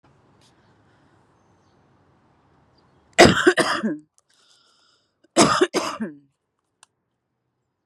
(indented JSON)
{
  "cough_length": "7.9 s",
  "cough_amplitude": 32767,
  "cough_signal_mean_std_ratio": 0.27,
  "survey_phase": "beta (2021-08-13 to 2022-03-07)",
  "age": "45-64",
  "gender": "Female",
  "wearing_mask": "No",
  "symptom_cough_any": true,
  "symptom_onset": "9 days",
  "smoker_status": "Current smoker (11 or more cigarettes per day)",
  "respiratory_condition_asthma": false,
  "respiratory_condition_other": false,
  "recruitment_source": "REACT",
  "submission_delay": "2 days",
  "covid_test_result": "Negative",
  "covid_test_method": "RT-qPCR"
}